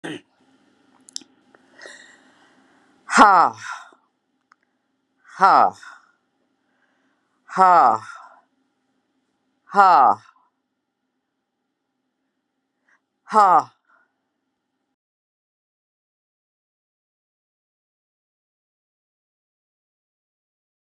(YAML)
exhalation_length: 21.0 s
exhalation_amplitude: 32768
exhalation_signal_mean_std_ratio: 0.23
survey_phase: beta (2021-08-13 to 2022-03-07)
age: 65+
gender: Female
wearing_mask: 'No'
symptom_none: true
symptom_onset: 13 days
smoker_status: Never smoked
respiratory_condition_asthma: false
respiratory_condition_other: false
recruitment_source: REACT
submission_delay: 7 days
covid_test_result: Negative
covid_test_method: RT-qPCR